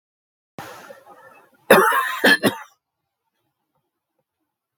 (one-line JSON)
{"cough_length": "4.8 s", "cough_amplitude": 32766, "cough_signal_mean_std_ratio": 0.3, "survey_phase": "beta (2021-08-13 to 2022-03-07)", "age": "65+", "gender": "Male", "wearing_mask": "No", "symptom_cough_any": true, "symptom_fever_high_temperature": true, "symptom_headache": true, "symptom_onset": "3 days", "smoker_status": "Ex-smoker", "respiratory_condition_asthma": false, "respiratory_condition_other": true, "recruitment_source": "Test and Trace", "submission_delay": "1 day", "covid_test_result": "Positive", "covid_test_method": "RT-qPCR", "covid_ct_value": 18.0, "covid_ct_gene": "N gene"}